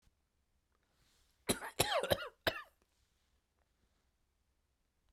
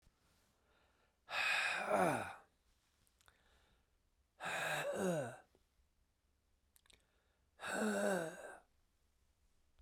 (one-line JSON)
{"cough_length": "5.1 s", "cough_amplitude": 6514, "cough_signal_mean_std_ratio": 0.26, "exhalation_length": "9.8 s", "exhalation_amplitude": 3100, "exhalation_signal_mean_std_ratio": 0.44, "survey_phase": "beta (2021-08-13 to 2022-03-07)", "age": "45-64", "gender": "Male", "wearing_mask": "No", "symptom_none": true, "smoker_status": "Never smoked", "respiratory_condition_asthma": false, "respiratory_condition_other": false, "recruitment_source": "REACT", "submission_delay": "1 day", "covid_test_result": "Negative", "covid_test_method": "RT-qPCR"}